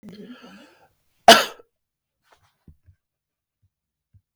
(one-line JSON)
{"cough_length": "4.4 s", "cough_amplitude": 32768, "cough_signal_mean_std_ratio": 0.15, "survey_phase": "beta (2021-08-13 to 2022-03-07)", "age": "18-44", "gender": "Male", "wearing_mask": "No", "symptom_runny_or_blocked_nose": true, "symptom_fatigue": true, "smoker_status": "Never smoked", "respiratory_condition_asthma": false, "respiratory_condition_other": false, "recruitment_source": "Test and Trace", "submission_delay": "0 days", "covid_test_result": "Negative", "covid_test_method": "LFT"}